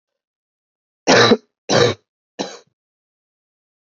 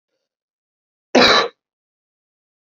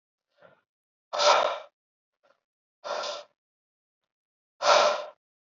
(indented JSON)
{
  "three_cough_length": "3.8 s",
  "three_cough_amplitude": 30973,
  "three_cough_signal_mean_std_ratio": 0.31,
  "cough_length": "2.7 s",
  "cough_amplitude": 30450,
  "cough_signal_mean_std_ratio": 0.27,
  "exhalation_length": "5.5 s",
  "exhalation_amplitude": 16168,
  "exhalation_signal_mean_std_ratio": 0.33,
  "survey_phase": "alpha (2021-03-01 to 2021-08-12)",
  "age": "18-44",
  "gender": "Male",
  "wearing_mask": "No",
  "symptom_cough_any": true,
  "symptom_fatigue": true,
  "symptom_fever_high_temperature": true,
  "symptom_headache": true,
  "symptom_onset": "2 days",
  "smoker_status": "Never smoked",
  "respiratory_condition_asthma": false,
  "respiratory_condition_other": false,
  "recruitment_source": "Test and Trace",
  "submission_delay": "2 days",
  "covid_test_result": "Positive",
  "covid_test_method": "ePCR"
}